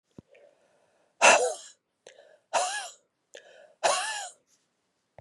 exhalation_length: 5.2 s
exhalation_amplitude: 18043
exhalation_signal_mean_std_ratio: 0.31
survey_phase: beta (2021-08-13 to 2022-03-07)
age: 45-64
gender: Female
wearing_mask: 'No'
symptom_cough_any: true
symptom_runny_or_blocked_nose: true
symptom_sore_throat: true
symptom_headache: true
symptom_other: true
symptom_onset: 2 days
smoker_status: Ex-smoker
respiratory_condition_asthma: false
respiratory_condition_other: false
recruitment_source: Test and Trace
submission_delay: 1 day
covid_test_result: Positive
covid_test_method: RT-qPCR
covid_ct_value: 27.6
covid_ct_gene: ORF1ab gene
covid_ct_mean: 27.6
covid_viral_load: 880 copies/ml
covid_viral_load_category: Minimal viral load (< 10K copies/ml)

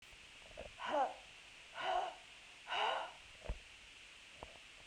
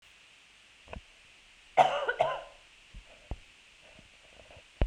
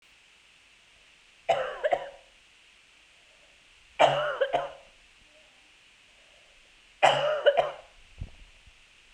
exhalation_length: 4.9 s
exhalation_amplitude: 3645
exhalation_signal_mean_std_ratio: 0.55
cough_length: 4.9 s
cough_amplitude: 14351
cough_signal_mean_std_ratio: 0.3
three_cough_length: 9.1 s
three_cough_amplitude: 16482
three_cough_signal_mean_std_ratio: 0.35
survey_phase: beta (2021-08-13 to 2022-03-07)
age: 45-64
gender: Female
wearing_mask: 'No'
symptom_cough_any: true
symptom_runny_or_blocked_nose: true
symptom_sore_throat: true
symptom_diarrhoea: true
symptom_fatigue: true
symptom_change_to_sense_of_smell_or_taste: true
symptom_loss_of_taste: true
symptom_onset: 4 days
smoker_status: Never smoked
respiratory_condition_asthma: true
respiratory_condition_other: false
recruitment_source: Test and Trace
submission_delay: 2 days
covid_test_result: Positive
covid_test_method: RT-qPCR
covid_ct_value: 23.9
covid_ct_gene: ORF1ab gene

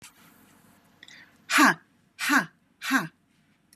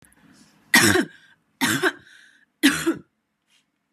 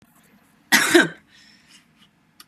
exhalation_length: 3.8 s
exhalation_amplitude: 15983
exhalation_signal_mean_std_ratio: 0.34
three_cough_length: 3.9 s
three_cough_amplitude: 25181
three_cough_signal_mean_std_ratio: 0.37
cough_length: 2.5 s
cough_amplitude: 29216
cough_signal_mean_std_ratio: 0.3
survey_phase: beta (2021-08-13 to 2022-03-07)
age: 45-64
gender: Female
wearing_mask: 'No'
symptom_none: true
symptom_onset: 12 days
smoker_status: Ex-smoker
respiratory_condition_asthma: false
respiratory_condition_other: false
recruitment_source: REACT
submission_delay: 3 days
covid_test_result: Negative
covid_test_method: RT-qPCR
influenza_a_test_result: Unknown/Void
influenza_b_test_result: Unknown/Void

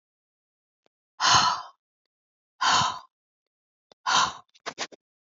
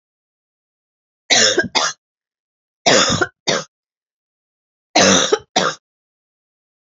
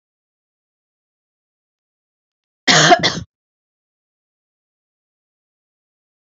exhalation_length: 5.3 s
exhalation_amplitude: 17330
exhalation_signal_mean_std_ratio: 0.36
three_cough_length: 7.0 s
three_cough_amplitude: 32049
three_cough_signal_mean_std_ratio: 0.38
cough_length: 6.3 s
cough_amplitude: 32767
cough_signal_mean_std_ratio: 0.21
survey_phase: beta (2021-08-13 to 2022-03-07)
age: 45-64
gender: Female
wearing_mask: 'No'
symptom_cough_any: true
symptom_runny_or_blocked_nose: true
symptom_fatigue: true
symptom_other: true
symptom_onset: 3 days
smoker_status: Ex-smoker
respiratory_condition_asthma: false
respiratory_condition_other: false
recruitment_source: Test and Trace
submission_delay: 2 days
covid_test_result: Positive
covid_test_method: ePCR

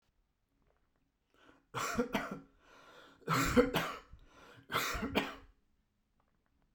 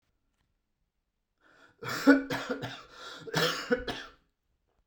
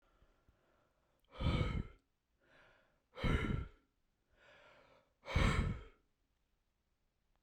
three_cough_length: 6.7 s
three_cough_amplitude: 6378
three_cough_signal_mean_std_ratio: 0.39
cough_length: 4.9 s
cough_amplitude: 13506
cough_signal_mean_std_ratio: 0.35
exhalation_length: 7.4 s
exhalation_amplitude: 3059
exhalation_signal_mean_std_ratio: 0.36
survey_phase: beta (2021-08-13 to 2022-03-07)
age: 45-64
gender: Male
wearing_mask: 'No'
symptom_sore_throat: true
smoker_status: Ex-smoker
respiratory_condition_asthma: false
respiratory_condition_other: false
recruitment_source: REACT
submission_delay: 0 days
covid_test_result: Negative
covid_test_method: RT-qPCR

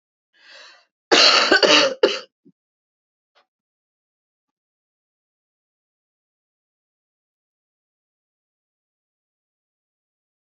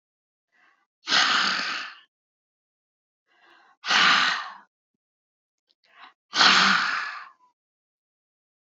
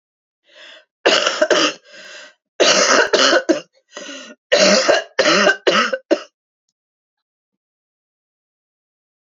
cough_length: 10.6 s
cough_amplitude: 32767
cough_signal_mean_std_ratio: 0.23
exhalation_length: 8.7 s
exhalation_amplitude: 18865
exhalation_signal_mean_std_ratio: 0.39
three_cough_length: 9.3 s
three_cough_amplitude: 32767
three_cough_signal_mean_std_ratio: 0.45
survey_phase: beta (2021-08-13 to 2022-03-07)
age: 65+
gender: Female
wearing_mask: 'No'
symptom_cough_any: true
symptom_runny_or_blocked_nose: true
symptom_shortness_of_breath: true
symptom_fatigue: true
smoker_status: Never smoked
respiratory_condition_asthma: false
respiratory_condition_other: true
recruitment_source: Test and Trace
submission_delay: 1 day
covid_test_result: Negative
covid_test_method: RT-qPCR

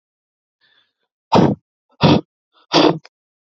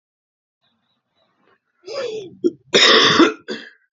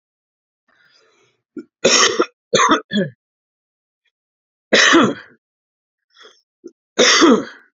exhalation_length: 3.5 s
exhalation_amplitude: 30067
exhalation_signal_mean_std_ratio: 0.34
cough_length: 3.9 s
cough_amplitude: 31498
cough_signal_mean_std_ratio: 0.38
three_cough_length: 7.8 s
three_cough_amplitude: 32767
three_cough_signal_mean_std_ratio: 0.38
survey_phase: alpha (2021-03-01 to 2021-08-12)
age: 18-44
gender: Male
wearing_mask: 'No'
symptom_cough_any: true
symptom_change_to_sense_of_smell_or_taste: true
symptom_loss_of_taste: true
smoker_status: Ex-smoker
respiratory_condition_asthma: true
respiratory_condition_other: false
recruitment_source: Test and Trace
submission_delay: 1 day
covid_test_result: Positive
covid_test_method: RT-qPCR
covid_ct_value: 20.0
covid_ct_gene: ORF1ab gene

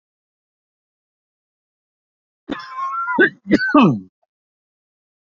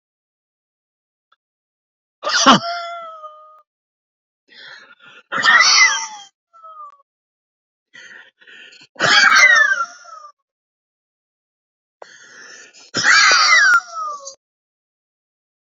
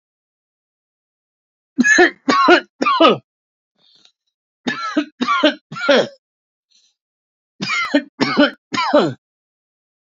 cough_length: 5.3 s
cough_amplitude: 32768
cough_signal_mean_std_ratio: 0.32
exhalation_length: 15.8 s
exhalation_amplitude: 30395
exhalation_signal_mean_std_ratio: 0.38
three_cough_length: 10.1 s
three_cough_amplitude: 29276
three_cough_signal_mean_std_ratio: 0.42
survey_phase: beta (2021-08-13 to 2022-03-07)
age: 45-64
gender: Male
wearing_mask: 'No'
symptom_none: true
smoker_status: Never smoked
respiratory_condition_asthma: false
respiratory_condition_other: false
recruitment_source: REACT
submission_delay: 2 days
covid_test_result: Negative
covid_test_method: RT-qPCR
influenza_a_test_result: Negative
influenza_b_test_result: Negative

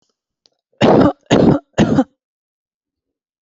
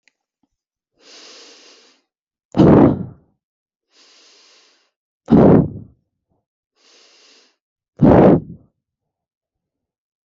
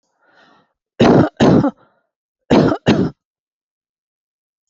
three_cough_length: 3.4 s
three_cough_amplitude: 28937
three_cough_signal_mean_std_ratio: 0.41
exhalation_length: 10.2 s
exhalation_amplitude: 30613
exhalation_signal_mean_std_ratio: 0.29
cough_length: 4.7 s
cough_amplitude: 28310
cough_signal_mean_std_ratio: 0.39
survey_phase: alpha (2021-03-01 to 2021-08-12)
age: 18-44
gender: Female
wearing_mask: 'No'
symptom_none: true
smoker_status: Never smoked
respiratory_condition_asthma: false
respiratory_condition_other: false
recruitment_source: REACT
submission_delay: 2 days
covid_test_result: Negative
covid_test_method: RT-qPCR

